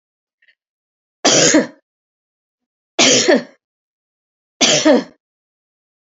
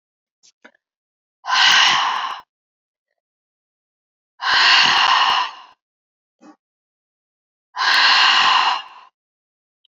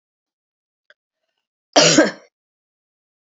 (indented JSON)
{
  "three_cough_length": "6.1 s",
  "three_cough_amplitude": 32767,
  "three_cough_signal_mean_std_ratio": 0.37,
  "exhalation_length": "9.9 s",
  "exhalation_amplitude": 29124,
  "exhalation_signal_mean_std_ratio": 0.46,
  "cough_length": "3.2 s",
  "cough_amplitude": 30115,
  "cough_signal_mean_std_ratio": 0.26,
  "survey_phase": "beta (2021-08-13 to 2022-03-07)",
  "age": "65+",
  "gender": "Female",
  "wearing_mask": "No",
  "symptom_runny_or_blocked_nose": true,
  "symptom_sore_throat": true,
  "smoker_status": "Never smoked",
  "respiratory_condition_asthma": false,
  "respiratory_condition_other": false,
  "recruitment_source": "Test and Trace",
  "submission_delay": "2 days",
  "covid_test_result": "Positive",
  "covid_test_method": "RT-qPCR",
  "covid_ct_value": 23.4,
  "covid_ct_gene": "ORF1ab gene"
}